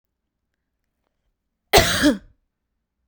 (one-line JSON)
{"cough_length": "3.1 s", "cough_amplitude": 32768, "cough_signal_mean_std_ratio": 0.28, "survey_phase": "beta (2021-08-13 to 2022-03-07)", "age": "18-44", "gender": "Female", "wearing_mask": "No", "symptom_none": true, "smoker_status": "Ex-smoker", "respiratory_condition_asthma": true, "respiratory_condition_other": false, "recruitment_source": "REACT", "submission_delay": "2 days", "covid_test_result": "Negative", "covid_test_method": "RT-qPCR", "influenza_a_test_result": "Unknown/Void", "influenza_b_test_result": "Unknown/Void"}